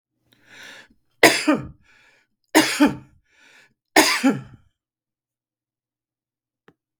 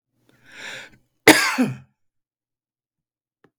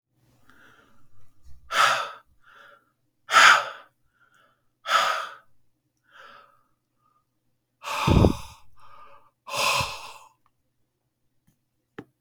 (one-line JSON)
{"three_cough_length": "7.0 s", "three_cough_amplitude": 32768, "three_cough_signal_mean_std_ratio": 0.29, "cough_length": "3.6 s", "cough_amplitude": 32768, "cough_signal_mean_std_ratio": 0.25, "exhalation_length": "12.2 s", "exhalation_amplitude": 30220, "exhalation_signal_mean_std_ratio": 0.31, "survey_phase": "beta (2021-08-13 to 2022-03-07)", "age": "65+", "gender": "Male", "wearing_mask": "No", "symptom_none": true, "smoker_status": "Ex-smoker", "respiratory_condition_asthma": false, "respiratory_condition_other": false, "recruitment_source": "REACT", "submission_delay": "1 day", "covid_test_result": "Negative", "covid_test_method": "RT-qPCR"}